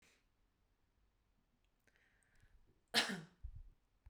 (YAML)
cough_length: 4.1 s
cough_amplitude: 3582
cough_signal_mean_std_ratio: 0.24
survey_phase: beta (2021-08-13 to 2022-03-07)
age: 45-64
gender: Female
wearing_mask: 'No'
symptom_runny_or_blocked_nose: true
symptom_fatigue: true
symptom_headache: true
symptom_onset: 3 days
smoker_status: Never smoked
respiratory_condition_asthma: false
respiratory_condition_other: false
recruitment_source: Test and Trace
submission_delay: 2 days
covid_test_result: Negative
covid_test_method: RT-qPCR